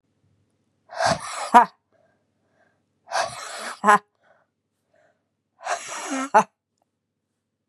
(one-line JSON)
{"exhalation_length": "7.7 s", "exhalation_amplitude": 32767, "exhalation_signal_mean_std_ratio": 0.28, "survey_phase": "beta (2021-08-13 to 2022-03-07)", "age": "18-44", "gender": "Female", "wearing_mask": "No", "symptom_cough_any": true, "symptom_runny_or_blocked_nose": true, "symptom_shortness_of_breath": true, "symptom_headache": true, "smoker_status": "Current smoker (e-cigarettes or vapes only)", "respiratory_condition_asthma": false, "respiratory_condition_other": false, "recruitment_source": "Test and Trace", "submission_delay": "2 days", "covid_test_result": "Positive", "covid_test_method": "RT-qPCR", "covid_ct_value": 16.0, "covid_ct_gene": "ORF1ab gene", "covid_ct_mean": 16.4, "covid_viral_load": "4100000 copies/ml", "covid_viral_load_category": "High viral load (>1M copies/ml)"}